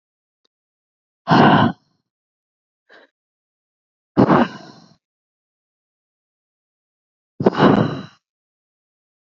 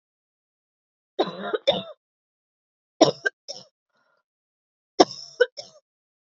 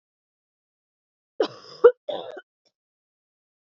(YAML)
exhalation_length: 9.2 s
exhalation_amplitude: 31748
exhalation_signal_mean_std_ratio: 0.28
three_cough_length: 6.3 s
three_cough_amplitude: 32254
three_cough_signal_mean_std_ratio: 0.22
cough_length: 3.8 s
cough_amplitude: 27661
cough_signal_mean_std_ratio: 0.17
survey_phase: beta (2021-08-13 to 2022-03-07)
age: 18-44
gender: Female
wearing_mask: 'No'
symptom_runny_or_blocked_nose: true
symptom_shortness_of_breath: true
symptom_sore_throat: true
symptom_other: true
smoker_status: Never smoked
respiratory_condition_asthma: false
respiratory_condition_other: false
recruitment_source: Test and Trace
submission_delay: 2 days
covid_test_result: Positive
covid_test_method: LFT